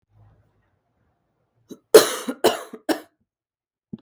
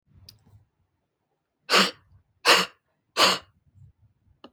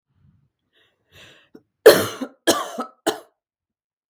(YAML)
cough_length: 4.0 s
cough_amplitude: 32768
cough_signal_mean_std_ratio: 0.21
exhalation_length: 4.5 s
exhalation_amplitude: 21311
exhalation_signal_mean_std_ratio: 0.29
three_cough_length: 4.1 s
three_cough_amplitude: 32768
three_cough_signal_mean_std_ratio: 0.24
survey_phase: beta (2021-08-13 to 2022-03-07)
age: 18-44
gender: Female
wearing_mask: 'No'
symptom_none: true
smoker_status: Never smoked
respiratory_condition_asthma: false
respiratory_condition_other: false
recruitment_source: REACT
submission_delay: 3 days
covid_test_result: Negative
covid_test_method: RT-qPCR
influenza_a_test_result: Negative
influenza_b_test_result: Negative